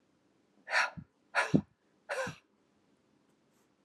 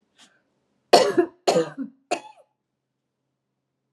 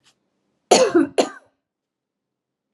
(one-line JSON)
{"exhalation_length": "3.8 s", "exhalation_amplitude": 10275, "exhalation_signal_mean_std_ratio": 0.3, "three_cough_length": "3.9 s", "three_cough_amplitude": 31224, "three_cough_signal_mean_std_ratio": 0.29, "cough_length": "2.7 s", "cough_amplitude": 32228, "cough_signal_mean_std_ratio": 0.31, "survey_phase": "beta (2021-08-13 to 2022-03-07)", "age": "45-64", "gender": "Female", "wearing_mask": "No", "symptom_none": true, "smoker_status": "Never smoked", "respiratory_condition_asthma": false, "respiratory_condition_other": false, "recruitment_source": "REACT", "submission_delay": "1 day", "covid_test_result": "Negative", "covid_test_method": "RT-qPCR", "influenza_a_test_result": "Unknown/Void", "influenza_b_test_result": "Unknown/Void"}